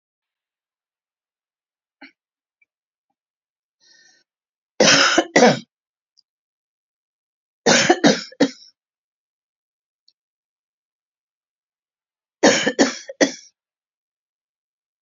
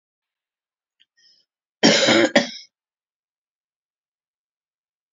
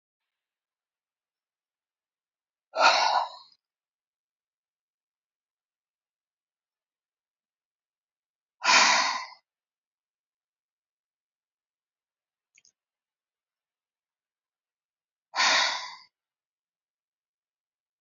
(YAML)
three_cough_length: 15.0 s
three_cough_amplitude: 32767
three_cough_signal_mean_std_ratio: 0.26
cough_length: 5.1 s
cough_amplitude: 30537
cough_signal_mean_std_ratio: 0.26
exhalation_length: 18.0 s
exhalation_amplitude: 15181
exhalation_signal_mean_std_ratio: 0.22
survey_phase: beta (2021-08-13 to 2022-03-07)
age: 65+
gender: Female
wearing_mask: 'No'
symptom_cough_any: true
symptom_shortness_of_breath: true
smoker_status: Never smoked
respiratory_condition_asthma: false
respiratory_condition_other: false
recruitment_source: REACT
submission_delay: 2 days
covid_test_result: Negative
covid_test_method: RT-qPCR
influenza_a_test_result: Negative
influenza_b_test_result: Negative